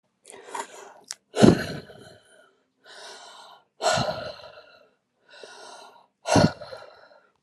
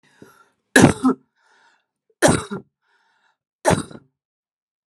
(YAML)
exhalation_length: 7.4 s
exhalation_amplitude: 30787
exhalation_signal_mean_std_ratio: 0.3
three_cough_length: 4.9 s
three_cough_amplitude: 32768
three_cough_signal_mean_std_ratio: 0.28
survey_phase: alpha (2021-03-01 to 2021-08-12)
age: 45-64
gender: Female
wearing_mask: 'No'
symptom_none: true
smoker_status: Current smoker (11 or more cigarettes per day)
respiratory_condition_asthma: false
respiratory_condition_other: false
recruitment_source: REACT
submission_delay: 4 days
covid_test_result: Negative
covid_test_method: RT-qPCR